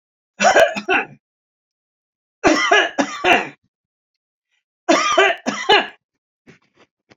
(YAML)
three_cough_length: 7.2 s
three_cough_amplitude: 30053
three_cough_signal_mean_std_ratio: 0.43
survey_phase: beta (2021-08-13 to 2022-03-07)
age: 65+
gender: Male
wearing_mask: 'No'
symptom_none: true
smoker_status: Ex-smoker
respiratory_condition_asthma: false
respiratory_condition_other: false
recruitment_source: REACT
submission_delay: 2 days
covid_test_result: Negative
covid_test_method: RT-qPCR
influenza_a_test_result: Negative
influenza_b_test_result: Negative